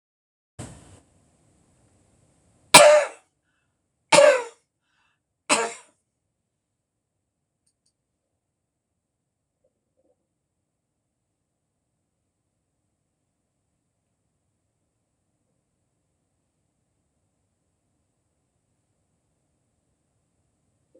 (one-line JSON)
{"three_cough_length": "21.0 s", "three_cough_amplitude": 26028, "three_cough_signal_mean_std_ratio": 0.15, "survey_phase": "alpha (2021-03-01 to 2021-08-12)", "age": "65+", "gender": "Female", "wearing_mask": "No", "symptom_none": true, "smoker_status": "Never smoked", "respiratory_condition_asthma": false, "respiratory_condition_other": false, "recruitment_source": "REACT", "submission_delay": "2 days", "covid_test_result": "Negative", "covid_test_method": "RT-qPCR"}